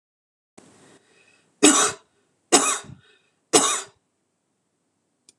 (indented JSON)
{
  "three_cough_length": "5.4 s",
  "three_cough_amplitude": 26028,
  "three_cough_signal_mean_std_ratio": 0.29,
  "survey_phase": "beta (2021-08-13 to 2022-03-07)",
  "age": "45-64",
  "gender": "Female",
  "wearing_mask": "No",
  "symptom_none": true,
  "smoker_status": "Never smoked",
  "respiratory_condition_asthma": false,
  "respiratory_condition_other": false,
  "recruitment_source": "REACT",
  "submission_delay": "1 day",
  "covid_test_result": "Negative",
  "covid_test_method": "RT-qPCR",
  "influenza_a_test_result": "Negative",
  "influenza_b_test_result": "Negative"
}